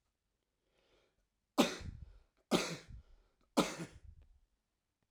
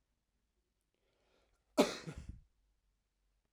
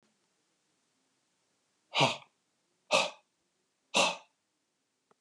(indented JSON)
{
  "three_cough_length": "5.1 s",
  "three_cough_amplitude": 6771,
  "three_cough_signal_mean_std_ratio": 0.28,
  "cough_length": "3.5 s",
  "cough_amplitude": 6327,
  "cough_signal_mean_std_ratio": 0.19,
  "exhalation_length": "5.2 s",
  "exhalation_amplitude": 10131,
  "exhalation_signal_mean_std_ratio": 0.26,
  "survey_phase": "alpha (2021-03-01 to 2021-08-12)",
  "age": "45-64",
  "gender": "Male",
  "wearing_mask": "No",
  "symptom_cough_any": true,
  "symptom_onset": "11 days",
  "smoker_status": "Never smoked",
  "respiratory_condition_asthma": false,
  "respiratory_condition_other": false,
  "recruitment_source": "REACT",
  "submission_delay": "2 days",
  "covid_test_result": "Negative",
  "covid_test_method": "RT-qPCR"
}